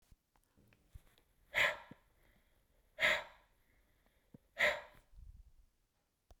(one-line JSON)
{"exhalation_length": "6.4 s", "exhalation_amplitude": 3870, "exhalation_signal_mean_std_ratio": 0.28, "survey_phase": "beta (2021-08-13 to 2022-03-07)", "age": "45-64", "gender": "Female", "wearing_mask": "No", "symptom_none": true, "smoker_status": "Never smoked", "respiratory_condition_asthma": false, "respiratory_condition_other": false, "recruitment_source": "REACT", "submission_delay": "2 days", "covid_test_result": "Negative", "covid_test_method": "RT-qPCR"}